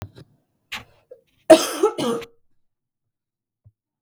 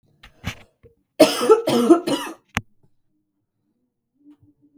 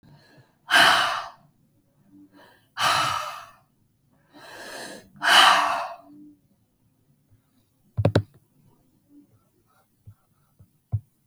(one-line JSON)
{"cough_length": "4.0 s", "cough_amplitude": 32768, "cough_signal_mean_std_ratio": 0.24, "three_cough_length": "4.8 s", "three_cough_amplitude": 32768, "three_cough_signal_mean_std_ratio": 0.33, "exhalation_length": "11.3 s", "exhalation_amplitude": 25671, "exhalation_signal_mean_std_ratio": 0.33, "survey_phase": "beta (2021-08-13 to 2022-03-07)", "age": "18-44", "gender": "Female", "wearing_mask": "No", "symptom_cough_any": true, "symptom_new_continuous_cough": true, "symptom_sore_throat": true, "symptom_onset": "3 days", "smoker_status": "Never smoked", "respiratory_condition_asthma": false, "respiratory_condition_other": false, "recruitment_source": "Test and Trace", "submission_delay": "1 day", "covid_test_result": "Negative", "covid_test_method": "RT-qPCR"}